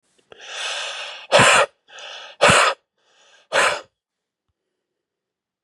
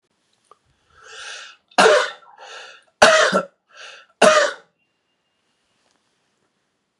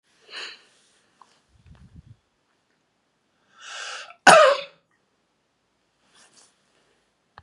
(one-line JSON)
{"exhalation_length": "5.6 s", "exhalation_amplitude": 29504, "exhalation_signal_mean_std_ratio": 0.38, "three_cough_length": "7.0 s", "three_cough_amplitude": 32768, "three_cough_signal_mean_std_ratio": 0.32, "cough_length": "7.4 s", "cough_amplitude": 32767, "cough_signal_mean_std_ratio": 0.19, "survey_phase": "beta (2021-08-13 to 2022-03-07)", "age": "45-64", "gender": "Male", "wearing_mask": "No", "symptom_cough_any": true, "symptom_runny_or_blocked_nose": true, "symptom_other": true, "symptom_onset": "2 days", "smoker_status": "Ex-smoker", "respiratory_condition_asthma": false, "respiratory_condition_other": false, "recruitment_source": "Test and Trace", "submission_delay": "1 day", "covid_test_result": "Positive", "covid_test_method": "RT-qPCR", "covid_ct_value": 12.3, "covid_ct_gene": "ORF1ab gene"}